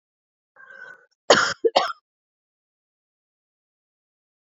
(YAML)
cough_length: 4.4 s
cough_amplitude: 27514
cough_signal_mean_std_ratio: 0.22
survey_phase: beta (2021-08-13 to 2022-03-07)
age: 45-64
gender: Female
wearing_mask: 'No'
symptom_none: true
symptom_onset: 12 days
smoker_status: Never smoked
respiratory_condition_asthma: true
respiratory_condition_other: false
recruitment_source: REACT
submission_delay: 1 day
covid_test_result: Negative
covid_test_method: RT-qPCR